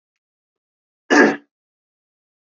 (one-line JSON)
{"cough_length": "2.5 s", "cough_amplitude": 27518, "cough_signal_mean_std_ratio": 0.24, "survey_phase": "beta (2021-08-13 to 2022-03-07)", "age": "18-44", "gender": "Male", "wearing_mask": "No", "symptom_fatigue": true, "symptom_headache": true, "symptom_change_to_sense_of_smell_or_taste": true, "symptom_onset": "4 days", "smoker_status": "Never smoked", "respiratory_condition_asthma": false, "respiratory_condition_other": false, "recruitment_source": "Test and Trace", "submission_delay": "2 days", "covid_test_result": "Positive", "covid_test_method": "ePCR"}